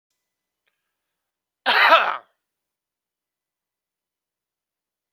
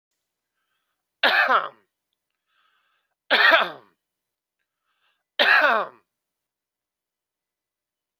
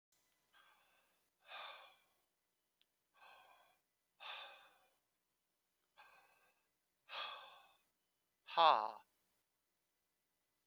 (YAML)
cough_length: 5.1 s
cough_amplitude: 30634
cough_signal_mean_std_ratio: 0.22
three_cough_length: 8.2 s
three_cough_amplitude: 26482
three_cough_signal_mean_std_ratio: 0.3
exhalation_length: 10.7 s
exhalation_amplitude: 4784
exhalation_signal_mean_std_ratio: 0.17
survey_phase: beta (2021-08-13 to 2022-03-07)
age: 45-64
gender: Male
wearing_mask: 'No'
symptom_none: true
smoker_status: Ex-smoker
respiratory_condition_asthma: false
respiratory_condition_other: false
recruitment_source: REACT
submission_delay: 5 days
covid_test_result: Negative
covid_test_method: RT-qPCR
influenza_a_test_result: Negative
influenza_b_test_result: Negative